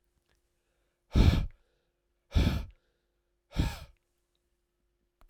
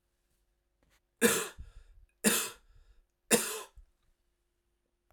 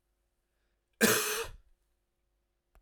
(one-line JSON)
{"exhalation_length": "5.3 s", "exhalation_amplitude": 12079, "exhalation_signal_mean_std_ratio": 0.29, "three_cough_length": "5.1 s", "three_cough_amplitude": 11415, "three_cough_signal_mean_std_ratio": 0.29, "cough_length": "2.8 s", "cough_amplitude": 12037, "cough_signal_mean_std_ratio": 0.3, "survey_phase": "beta (2021-08-13 to 2022-03-07)", "age": "45-64", "gender": "Male", "wearing_mask": "No", "symptom_cough_any": true, "symptom_runny_or_blocked_nose": true, "symptom_headache": true, "smoker_status": "Never smoked", "respiratory_condition_asthma": false, "respiratory_condition_other": false, "recruitment_source": "Test and Trace", "submission_delay": "4 days", "covid_test_method": "RT-qPCR"}